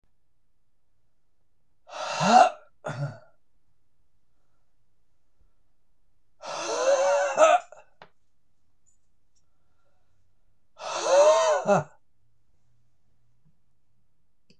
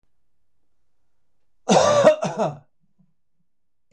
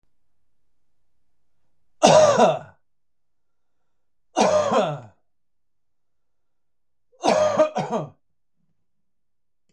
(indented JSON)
{
  "exhalation_length": "14.6 s",
  "exhalation_amplitude": 19131,
  "exhalation_signal_mean_std_ratio": 0.36,
  "cough_length": "3.9 s",
  "cough_amplitude": 22753,
  "cough_signal_mean_std_ratio": 0.35,
  "three_cough_length": "9.7 s",
  "three_cough_amplitude": 26028,
  "three_cough_signal_mean_std_ratio": 0.35,
  "survey_phase": "beta (2021-08-13 to 2022-03-07)",
  "age": "45-64",
  "gender": "Male",
  "wearing_mask": "No",
  "symptom_none": true,
  "symptom_onset": "12 days",
  "smoker_status": "Never smoked",
  "respiratory_condition_asthma": false,
  "respiratory_condition_other": false,
  "recruitment_source": "REACT",
  "submission_delay": "1 day",
  "covid_test_result": "Negative",
  "covid_test_method": "RT-qPCR",
  "influenza_a_test_result": "Negative",
  "influenza_b_test_result": "Negative"
}